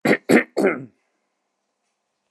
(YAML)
cough_length: 2.3 s
cough_amplitude: 27854
cough_signal_mean_std_ratio: 0.34
survey_phase: beta (2021-08-13 to 2022-03-07)
age: 45-64
gender: Male
wearing_mask: 'No'
symptom_abdominal_pain: true
smoker_status: Never smoked
respiratory_condition_asthma: false
respiratory_condition_other: false
recruitment_source: REACT
submission_delay: 1 day
covid_test_result: Negative
covid_test_method: RT-qPCR